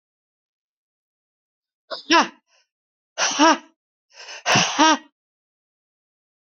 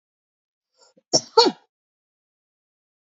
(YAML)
exhalation_length: 6.5 s
exhalation_amplitude: 28725
exhalation_signal_mean_std_ratio: 0.3
cough_length: 3.1 s
cough_amplitude: 26741
cough_signal_mean_std_ratio: 0.19
survey_phase: beta (2021-08-13 to 2022-03-07)
age: 65+
gender: Female
wearing_mask: 'No'
symptom_none: true
symptom_onset: 7 days
smoker_status: Ex-smoker
respiratory_condition_asthma: false
respiratory_condition_other: false
recruitment_source: REACT
submission_delay: 1 day
covid_test_result: Negative
covid_test_method: RT-qPCR
influenza_a_test_result: Negative
influenza_b_test_result: Negative